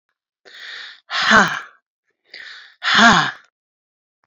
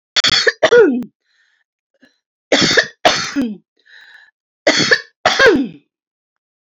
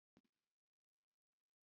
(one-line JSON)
{"exhalation_length": "4.3 s", "exhalation_amplitude": 28538, "exhalation_signal_mean_std_ratio": 0.37, "three_cough_length": "6.7 s", "three_cough_amplitude": 32723, "three_cough_signal_mean_std_ratio": 0.46, "cough_length": "1.6 s", "cough_amplitude": 62, "cough_signal_mean_std_ratio": 0.12, "survey_phase": "beta (2021-08-13 to 2022-03-07)", "age": "45-64", "gender": "Female", "wearing_mask": "No", "symptom_none": true, "smoker_status": "Never smoked", "respiratory_condition_asthma": true, "respiratory_condition_other": true, "recruitment_source": "REACT", "submission_delay": "2 days", "covid_test_result": "Negative", "covid_test_method": "RT-qPCR"}